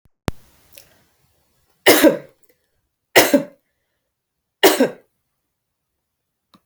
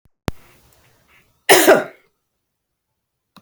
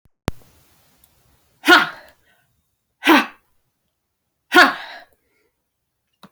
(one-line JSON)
{"three_cough_length": "6.7 s", "three_cough_amplitude": 32768, "three_cough_signal_mean_std_ratio": 0.27, "cough_length": "3.4 s", "cough_amplitude": 32768, "cough_signal_mean_std_ratio": 0.26, "exhalation_length": "6.3 s", "exhalation_amplitude": 32108, "exhalation_signal_mean_std_ratio": 0.25, "survey_phase": "beta (2021-08-13 to 2022-03-07)", "age": "45-64", "gender": "Female", "wearing_mask": "No", "symptom_cough_any": true, "symptom_runny_or_blocked_nose": true, "symptom_fever_high_temperature": true, "symptom_onset": "2 days", "smoker_status": "Never smoked", "respiratory_condition_asthma": false, "respiratory_condition_other": false, "recruitment_source": "Test and Trace", "submission_delay": "2 days", "covid_test_method": "RT-qPCR", "covid_ct_value": 34.8, "covid_ct_gene": "ORF1ab gene"}